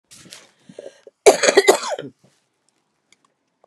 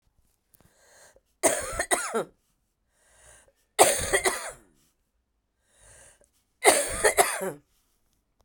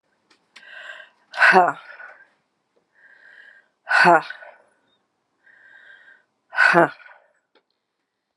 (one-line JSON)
{"cough_length": "3.7 s", "cough_amplitude": 32768, "cough_signal_mean_std_ratio": 0.27, "three_cough_length": "8.4 s", "three_cough_amplitude": 26487, "three_cough_signal_mean_std_ratio": 0.34, "exhalation_length": "8.4 s", "exhalation_amplitude": 30830, "exhalation_signal_mean_std_ratio": 0.29, "survey_phase": "beta (2021-08-13 to 2022-03-07)", "age": "45-64", "gender": "Female", "wearing_mask": "No", "symptom_cough_any": true, "symptom_new_continuous_cough": true, "symptom_runny_or_blocked_nose": true, "symptom_fatigue": true, "symptom_fever_high_temperature": true, "symptom_onset": "3 days", "smoker_status": "Never smoked", "respiratory_condition_asthma": false, "respiratory_condition_other": false, "recruitment_source": "Test and Trace", "submission_delay": "1 day", "covid_test_result": "Positive", "covid_test_method": "RT-qPCR", "covid_ct_value": 14.4, "covid_ct_gene": "ORF1ab gene"}